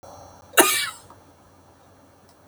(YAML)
cough_length: 2.5 s
cough_amplitude: 32767
cough_signal_mean_std_ratio: 0.29
survey_phase: alpha (2021-03-01 to 2021-08-12)
age: 65+
gender: Female
wearing_mask: 'No'
symptom_cough_any: true
symptom_shortness_of_breath: true
symptom_abdominal_pain: true
smoker_status: Never smoked
respiratory_condition_asthma: false
respiratory_condition_other: false
recruitment_source: REACT
submission_delay: 2 days
covid_test_result: Negative
covid_test_method: RT-qPCR